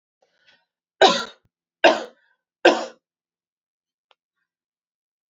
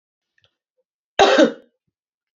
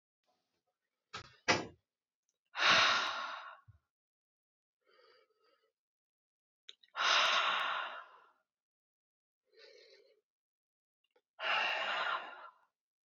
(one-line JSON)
{"three_cough_length": "5.3 s", "three_cough_amplitude": 32767, "three_cough_signal_mean_std_ratio": 0.23, "cough_length": "2.4 s", "cough_amplitude": 31260, "cough_signal_mean_std_ratio": 0.29, "exhalation_length": "13.1 s", "exhalation_amplitude": 5853, "exhalation_signal_mean_std_ratio": 0.36, "survey_phase": "beta (2021-08-13 to 2022-03-07)", "age": "18-44", "gender": "Female", "wearing_mask": "No", "symptom_cough_any": true, "symptom_runny_or_blocked_nose": true, "symptom_fatigue": true, "symptom_headache": true, "smoker_status": "Ex-smoker", "respiratory_condition_asthma": false, "respiratory_condition_other": false, "recruitment_source": "Test and Trace", "submission_delay": "1 day", "covid_test_result": "Positive", "covid_test_method": "LFT"}